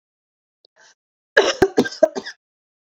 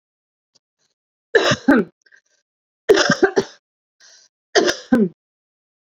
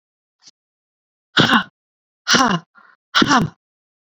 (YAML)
cough_length: 3.0 s
cough_amplitude: 27238
cough_signal_mean_std_ratio: 0.28
three_cough_length: 6.0 s
three_cough_amplitude: 29735
three_cough_signal_mean_std_ratio: 0.34
exhalation_length: 4.1 s
exhalation_amplitude: 32022
exhalation_signal_mean_std_ratio: 0.37
survey_phase: beta (2021-08-13 to 2022-03-07)
age: 18-44
gender: Female
wearing_mask: 'No'
symptom_none: true
smoker_status: Never smoked
respiratory_condition_asthma: true
respiratory_condition_other: true
recruitment_source: Test and Trace
submission_delay: 2 days
covid_test_result: Positive
covid_test_method: RT-qPCR
covid_ct_value: 37.1
covid_ct_gene: N gene